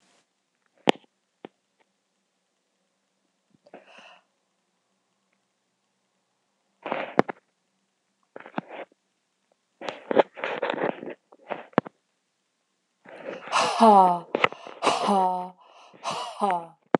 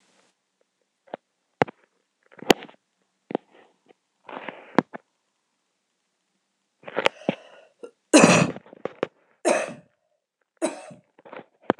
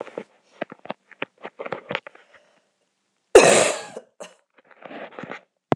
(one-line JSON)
{"exhalation_length": "17.0 s", "exhalation_amplitude": 26028, "exhalation_signal_mean_std_ratio": 0.28, "three_cough_length": "11.8 s", "three_cough_amplitude": 26028, "three_cough_signal_mean_std_ratio": 0.21, "cough_length": "5.8 s", "cough_amplitude": 26028, "cough_signal_mean_std_ratio": 0.25, "survey_phase": "beta (2021-08-13 to 2022-03-07)", "age": "45-64", "gender": "Female", "wearing_mask": "No", "symptom_cough_any": true, "symptom_runny_or_blocked_nose": true, "symptom_sore_throat": true, "symptom_fatigue": true, "symptom_fever_high_temperature": true, "symptom_change_to_sense_of_smell_or_taste": true, "symptom_loss_of_taste": true, "symptom_onset": "3 days", "smoker_status": "Never smoked", "respiratory_condition_asthma": false, "respiratory_condition_other": false, "recruitment_source": "Test and Trace", "submission_delay": "2 days", "covid_test_result": "Positive", "covid_test_method": "RT-qPCR", "covid_ct_value": 20.2, "covid_ct_gene": "ORF1ab gene", "covid_ct_mean": 21.4, "covid_viral_load": "92000 copies/ml", "covid_viral_load_category": "Low viral load (10K-1M copies/ml)"}